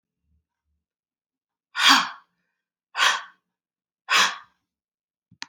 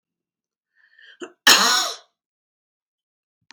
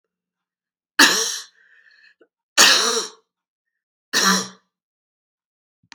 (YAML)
exhalation_length: 5.5 s
exhalation_amplitude: 25711
exhalation_signal_mean_std_ratio: 0.28
cough_length: 3.5 s
cough_amplitude: 32767
cough_signal_mean_std_ratio: 0.27
three_cough_length: 5.9 s
three_cough_amplitude: 32768
three_cough_signal_mean_std_ratio: 0.33
survey_phase: beta (2021-08-13 to 2022-03-07)
age: 65+
gender: Female
wearing_mask: 'No'
symptom_cough_any: true
symptom_runny_or_blocked_nose: true
symptom_sore_throat: true
symptom_onset: 5 days
smoker_status: Never smoked
respiratory_condition_asthma: false
respiratory_condition_other: false
recruitment_source: REACT
submission_delay: 4 days
covid_test_result: Negative
covid_test_method: RT-qPCR
influenza_a_test_result: Negative
influenza_b_test_result: Negative